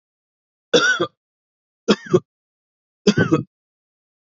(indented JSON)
{
  "three_cough_length": "4.3 s",
  "three_cough_amplitude": 27232,
  "three_cough_signal_mean_std_ratio": 0.32,
  "survey_phase": "beta (2021-08-13 to 2022-03-07)",
  "age": "18-44",
  "gender": "Male",
  "wearing_mask": "No",
  "symptom_none": true,
  "smoker_status": "Ex-smoker",
  "respiratory_condition_asthma": false,
  "respiratory_condition_other": false,
  "recruitment_source": "REACT",
  "submission_delay": "1 day",
  "covid_test_result": "Negative",
  "covid_test_method": "RT-qPCR",
  "influenza_a_test_result": "Negative",
  "influenza_b_test_result": "Negative"
}